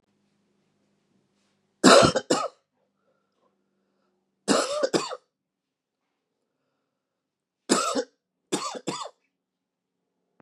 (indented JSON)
{
  "three_cough_length": "10.4 s",
  "three_cough_amplitude": 26562,
  "three_cough_signal_mean_std_ratio": 0.27,
  "survey_phase": "beta (2021-08-13 to 2022-03-07)",
  "age": "45-64",
  "gender": "Male",
  "wearing_mask": "No",
  "symptom_cough_any": true,
  "symptom_sore_throat": true,
  "symptom_diarrhoea": true,
  "symptom_fatigue": true,
  "symptom_change_to_sense_of_smell_or_taste": true,
  "symptom_loss_of_taste": true,
  "symptom_onset": "4 days",
  "smoker_status": "Ex-smoker",
  "respiratory_condition_asthma": false,
  "respiratory_condition_other": false,
  "recruitment_source": "Test and Trace",
  "submission_delay": "2 days",
  "covid_test_result": "Positive",
  "covid_test_method": "RT-qPCR",
  "covid_ct_value": 36.0,
  "covid_ct_gene": "N gene"
}